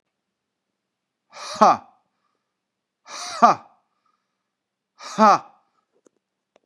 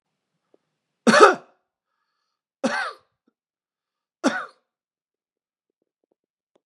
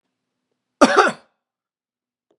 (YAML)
exhalation_length: 6.7 s
exhalation_amplitude: 32634
exhalation_signal_mean_std_ratio: 0.22
three_cough_length: 6.7 s
three_cough_amplitude: 32767
three_cough_signal_mean_std_ratio: 0.21
cough_length: 2.4 s
cough_amplitude: 32768
cough_signal_mean_std_ratio: 0.25
survey_phase: beta (2021-08-13 to 2022-03-07)
age: 45-64
gender: Male
wearing_mask: 'No'
symptom_none: true
smoker_status: Never smoked
respiratory_condition_asthma: false
respiratory_condition_other: false
recruitment_source: REACT
submission_delay: 2 days
covid_test_result: Negative
covid_test_method: RT-qPCR
influenza_a_test_result: Negative
influenza_b_test_result: Negative